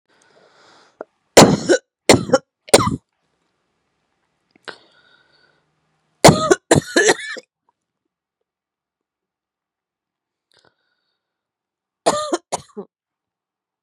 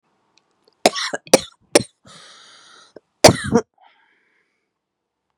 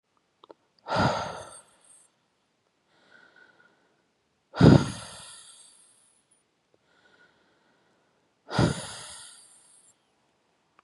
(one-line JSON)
{"three_cough_length": "13.8 s", "three_cough_amplitude": 32768, "three_cough_signal_mean_std_ratio": 0.24, "cough_length": "5.4 s", "cough_amplitude": 32768, "cough_signal_mean_std_ratio": 0.21, "exhalation_length": "10.8 s", "exhalation_amplitude": 24920, "exhalation_signal_mean_std_ratio": 0.22, "survey_phase": "beta (2021-08-13 to 2022-03-07)", "age": "18-44", "gender": "Female", "wearing_mask": "No", "symptom_cough_any": true, "symptom_runny_or_blocked_nose": true, "symptom_shortness_of_breath": true, "symptom_abdominal_pain": true, "symptom_diarrhoea": true, "symptom_fatigue": true, "symptom_fever_high_temperature": true, "symptom_headache": true, "symptom_onset": "2 days", "smoker_status": "Current smoker (1 to 10 cigarettes per day)", "respiratory_condition_asthma": false, "respiratory_condition_other": false, "recruitment_source": "Test and Trace", "submission_delay": "2 days", "covid_test_result": "Positive", "covid_test_method": "RT-qPCR", "covid_ct_value": 23.5, "covid_ct_gene": "ORF1ab gene"}